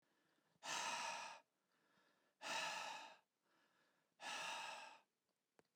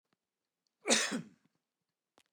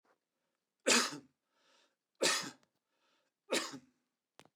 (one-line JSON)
{"exhalation_length": "5.8 s", "exhalation_amplitude": 742, "exhalation_signal_mean_std_ratio": 0.53, "cough_length": "2.3 s", "cough_amplitude": 7881, "cough_signal_mean_std_ratio": 0.28, "three_cough_length": "4.6 s", "three_cough_amplitude": 6881, "three_cough_signal_mean_std_ratio": 0.3, "survey_phase": "beta (2021-08-13 to 2022-03-07)", "age": "45-64", "gender": "Male", "wearing_mask": "No", "symptom_none": true, "smoker_status": "Ex-smoker", "respiratory_condition_asthma": false, "respiratory_condition_other": false, "recruitment_source": "REACT", "submission_delay": "0 days", "covid_test_result": "Negative", "covid_test_method": "RT-qPCR"}